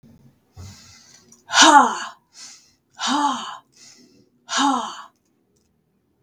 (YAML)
exhalation_length: 6.2 s
exhalation_amplitude: 32768
exhalation_signal_mean_std_ratio: 0.34
survey_phase: beta (2021-08-13 to 2022-03-07)
age: 18-44
gender: Female
wearing_mask: 'No'
symptom_cough_any: true
symptom_runny_or_blocked_nose: true
symptom_change_to_sense_of_smell_or_taste: true
symptom_onset: 8 days
smoker_status: Never smoked
respiratory_condition_asthma: false
respiratory_condition_other: false
recruitment_source: REACT
submission_delay: 2 days
covid_test_result: Negative
covid_test_method: RT-qPCR
influenza_a_test_result: Negative
influenza_b_test_result: Negative